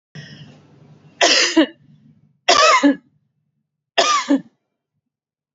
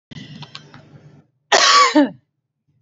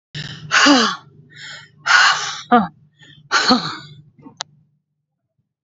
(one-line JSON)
{"three_cough_length": "5.5 s", "three_cough_amplitude": 32290, "three_cough_signal_mean_std_ratio": 0.4, "cough_length": "2.8 s", "cough_amplitude": 29624, "cough_signal_mean_std_ratio": 0.39, "exhalation_length": "5.6 s", "exhalation_amplitude": 31007, "exhalation_signal_mean_std_ratio": 0.43, "survey_phase": "beta (2021-08-13 to 2022-03-07)", "age": "45-64", "gender": "Female", "wearing_mask": "No", "symptom_headache": true, "symptom_onset": "12 days", "smoker_status": "Never smoked", "respiratory_condition_asthma": false, "respiratory_condition_other": false, "recruitment_source": "REACT", "submission_delay": "4 days", "covid_test_result": "Negative", "covid_test_method": "RT-qPCR", "influenza_a_test_result": "Negative", "influenza_b_test_result": "Negative"}